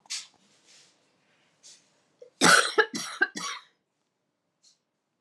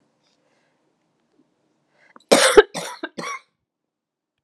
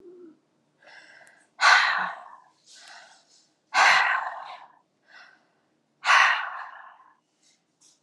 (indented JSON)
{
  "three_cough_length": "5.2 s",
  "three_cough_amplitude": 18042,
  "three_cough_signal_mean_std_ratio": 0.27,
  "cough_length": "4.4 s",
  "cough_amplitude": 32767,
  "cough_signal_mean_std_ratio": 0.22,
  "exhalation_length": "8.0 s",
  "exhalation_amplitude": 20219,
  "exhalation_signal_mean_std_ratio": 0.36,
  "survey_phase": "alpha (2021-03-01 to 2021-08-12)",
  "age": "45-64",
  "gender": "Female",
  "wearing_mask": "No",
  "symptom_new_continuous_cough": true,
  "symptom_shortness_of_breath": true,
  "symptom_fatigue": true,
  "symptom_headache": true,
  "symptom_change_to_sense_of_smell_or_taste": true,
  "symptom_onset": "4 days",
  "smoker_status": "Never smoked",
  "respiratory_condition_asthma": false,
  "respiratory_condition_other": false,
  "recruitment_source": "Test and Trace",
  "submission_delay": "1 day",
  "covid_test_result": "Positive",
  "covid_test_method": "RT-qPCR",
  "covid_ct_value": 19.4,
  "covid_ct_gene": "ORF1ab gene",
  "covid_ct_mean": 19.5,
  "covid_viral_load": "390000 copies/ml",
  "covid_viral_load_category": "Low viral load (10K-1M copies/ml)"
}